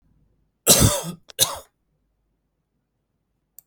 cough_length: 3.7 s
cough_amplitude: 32766
cough_signal_mean_std_ratio: 0.27
survey_phase: beta (2021-08-13 to 2022-03-07)
age: 45-64
gender: Male
wearing_mask: 'No'
symptom_none: true
smoker_status: Ex-smoker
respiratory_condition_asthma: false
respiratory_condition_other: false
recruitment_source: Test and Trace
submission_delay: 2 days
covid_test_result: Negative
covid_test_method: RT-qPCR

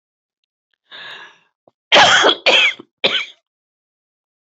cough_length: 4.4 s
cough_amplitude: 30840
cough_signal_mean_std_ratio: 0.37
survey_phase: beta (2021-08-13 to 2022-03-07)
age: 65+
gender: Female
wearing_mask: 'No'
symptom_cough_any: true
symptom_sore_throat: true
symptom_onset: 5 days
smoker_status: Never smoked
respiratory_condition_asthma: false
respiratory_condition_other: false
recruitment_source: Test and Trace
submission_delay: 3 days
covid_test_result: Positive
covid_test_method: ePCR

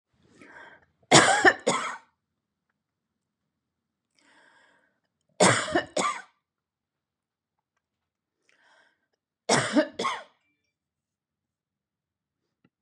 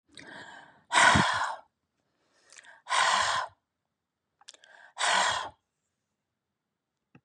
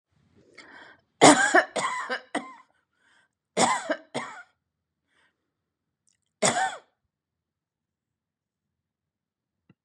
three_cough_length: 12.8 s
three_cough_amplitude: 27906
three_cough_signal_mean_std_ratio: 0.26
exhalation_length: 7.2 s
exhalation_amplitude: 12544
exhalation_signal_mean_std_ratio: 0.39
cough_length: 9.8 s
cough_amplitude: 30944
cough_signal_mean_std_ratio: 0.27
survey_phase: beta (2021-08-13 to 2022-03-07)
age: 65+
gender: Female
wearing_mask: 'No'
symptom_none: true
symptom_onset: 2 days
smoker_status: Never smoked
respiratory_condition_asthma: false
respiratory_condition_other: false
recruitment_source: REACT
submission_delay: 2 days
covid_test_result: Negative
covid_test_method: RT-qPCR
influenza_a_test_result: Negative
influenza_b_test_result: Negative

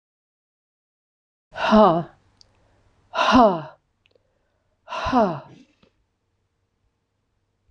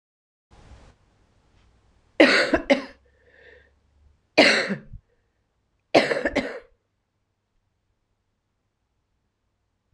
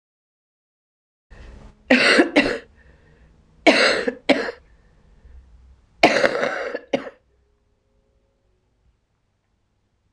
exhalation_length: 7.7 s
exhalation_amplitude: 22552
exhalation_signal_mean_std_ratio: 0.31
cough_length: 9.9 s
cough_amplitude: 26028
cough_signal_mean_std_ratio: 0.27
three_cough_length: 10.1 s
three_cough_amplitude: 26028
three_cough_signal_mean_std_ratio: 0.33
survey_phase: beta (2021-08-13 to 2022-03-07)
age: 65+
gender: Female
wearing_mask: 'No'
symptom_cough_any: true
symptom_new_continuous_cough: true
symptom_runny_or_blocked_nose: true
symptom_sore_throat: true
symptom_fatigue: true
symptom_headache: true
symptom_onset: 6 days
smoker_status: Never smoked
respiratory_condition_asthma: false
respiratory_condition_other: false
recruitment_source: REACT
submission_delay: 0 days
covid_test_result: Negative
covid_test_method: RT-qPCR
influenza_a_test_result: Negative
influenza_b_test_result: Negative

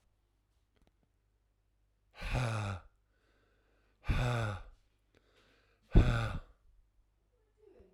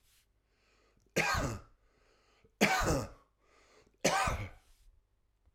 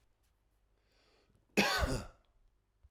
exhalation_length: 7.9 s
exhalation_amplitude: 9993
exhalation_signal_mean_std_ratio: 0.32
three_cough_length: 5.5 s
three_cough_amplitude: 8478
three_cough_signal_mean_std_ratio: 0.4
cough_length: 2.9 s
cough_amplitude: 6470
cough_signal_mean_std_ratio: 0.32
survey_phase: beta (2021-08-13 to 2022-03-07)
age: 45-64
gender: Male
wearing_mask: 'No'
symptom_cough_any: true
symptom_new_continuous_cough: true
symptom_runny_or_blocked_nose: true
symptom_shortness_of_breath: true
symptom_sore_throat: true
symptom_abdominal_pain: true
symptom_diarrhoea: true
symptom_fatigue: true
symptom_fever_high_temperature: true
symptom_headache: true
symptom_change_to_sense_of_smell_or_taste: true
smoker_status: Ex-smoker
respiratory_condition_asthma: false
respiratory_condition_other: false
recruitment_source: Test and Trace
submission_delay: 2 days
covid_test_result: Positive
covid_test_method: ePCR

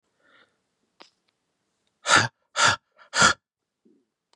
exhalation_length: 4.4 s
exhalation_amplitude: 26169
exhalation_signal_mean_std_ratio: 0.28
survey_phase: beta (2021-08-13 to 2022-03-07)
age: 18-44
gender: Male
wearing_mask: 'No'
symptom_cough_any: true
symptom_new_continuous_cough: true
symptom_runny_or_blocked_nose: true
symptom_onset: 3 days
smoker_status: Ex-smoker
respiratory_condition_asthma: false
respiratory_condition_other: false
recruitment_source: Test and Trace
submission_delay: 2 days
covid_test_result: Positive
covid_test_method: RT-qPCR
covid_ct_value: 18.7
covid_ct_gene: ORF1ab gene
covid_ct_mean: 19.2
covid_viral_load: 500000 copies/ml
covid_viral_load_category: Low viral load (10K-1M copies/ml)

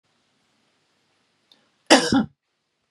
cough_length: 2.9 s
cough_amplitude: 32762
cough_signal_mean_std_ratio: 0.24
survey_phase: beta (2021-08-13 to 2022-03-07)
age: 18-44
gender: Female
wearing_mask: 'No'
symptom_none: true
smoker_status: Ex-smoker
respiratory_condition_asthma: false
respiratory_condition_other: false
recruitment_source: REACT
submission_delay: 2 days
covid_test_result: Negative
covid_test_method: RT-qPCR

